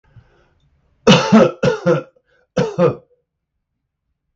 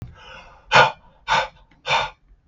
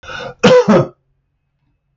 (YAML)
three_cough_length: 4.4 s
three_cough_amplitude: 32768
three_cough_signal_mean_std_ratio: 0.38
exhalation_length: 2.5 s
exhalation_amplitude: 32768
exhalation_signal_mean_std_ratio: 0.39
cough_length: 2.0 s
cough_amplitude: 32768
cough_signal_mean_std_ratio: 0.43
survey_phase: beta (2021-08-13 to 2022-03-07)
age: 45-64
gender: Male
wearing_mask: 'No'
symptom_none: true
smoker_status: Ex-smoker
respiratory_condition_asthma: false
respiratory_condition_other: false
recruitment_source: REACT
submission_delay: 0 days
covid_test_result: Negative
covid_test_method: RT-qPCR
influenza_a_test_result: Negative
influenza_b_test_result: Negative